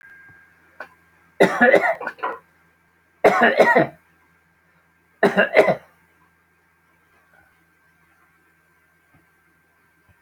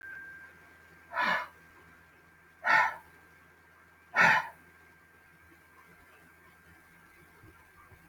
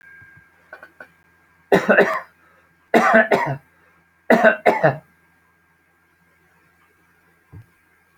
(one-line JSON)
{"three_cough_length": "10.2 s", "three_cough_amplitude": 28374, "three_cough_signal_mean_std_ratio": 0.31, "exhalation_length": "8.1 s", "exhalation_amplitude": 11074, "exhalation_signal_mean_std_ratio": 0.31, "cough_length": "8.2 s", "cough_amplitude": 32768, "cough_signal_mean_std_ratio": 0.33, "survey_phase": "alpha (2021-03-01 to 2021-08-12)", "age": "65+", "gender": "Male", "wearing_mask": "No", "symptom_fatigue": true, "symptom_change_to_sense_of_smell_or_taste": true, "symptom_loss_of_taste": true, "symptom_onset": "12 days", "smoker_status": "Never smoked", "respiratory_condition_asthma": false, "respiratory_condition_other": false, "recruitment_source": "REACT", "submission_delay": "2 days", "covid_test_result": "Negative", "covid_test_method": "RT-qPCR"}